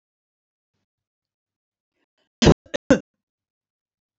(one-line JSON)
{"cough_length": "4.2 s", "cough_amplitude": 30076, "cough_signal_mean_std_ratio": 0.16, "survey_phase": "alpha (2021-03-01 to 2021-08-12)", "age": "45-64", "gender": "Female", "wearing_mask": "No", "symptom_none": true, "smoker_status": "Ex-smoker", "respiratory_condition_asthma": false, "respiratory_condition_other": false, "recruitment_source": "REACT", "submission_delay": "2 days", "covid_test_result": "Negative", "covid_test_method": "RT-qPCR"}